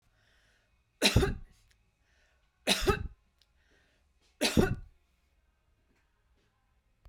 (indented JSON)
{
  "three_cough_length": "7.1 s",
  "three_cough_amplitude": 9914,
  "three_cough_signal_mean_std_ratio": 0.29,
  "survey_phase": "beta (2021-08-13 to 2022-03-07)",
  "age": "65+",
  "gender": "Female",
  "wearing_mask": "No",
  "symptom_none": true,
  "smoker_status": "Ex-smoker",
  "respiratory_condition_asthma": false,
  "respiratory_condition_other": false,
  "recruitment_source": "REACT",
  "submission_delay": "2 days",
  "covid_test_result": "Negative",
  "covid_test_method": "RT-qPCR",
  "influenza_a_test_result": "Negative",
  "influenza_b_test_result": "Negative"
}